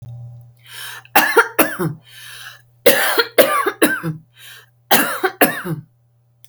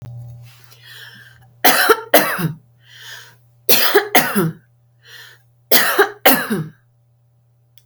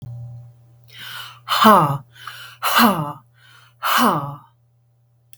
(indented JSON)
{
  "cough_length": "6.5 s",
  "cough_amplitude": 32768,
  "cough_signal_mean_std_ratio": 0.48,
  "three_cough_length": "7.9 s",
  "three_cough_amplitude": 32768,
  "three_cough_signal_mean_std_ratio": 0.43,
  "exhalation_length": "5.4 s",
  "exhalation_amplitude": 32768,
  "exhalation_signal_mean_std_ratio": 0.44,
  "survey_phase": "beta (2021-08-13 to 2022-03-07)",
  "age": "65+",
  "gender": "Female",
  "wearing_mask": "No",
  "symptom_none": true,
  "smoker_status": "Ex-smoker",
  "respiratory_condition_asthma": false,
  "respiratory_condition_other": false,
  "recruitment_source": "REACT",
  "submission_delay": "3 days",
  "covid_test_result": "Negative",
  "covid_test_method": "RT-qPCR",
  "influenza_a_test_result": "Negative",
  "influenza_b_test_result": "Negative"
}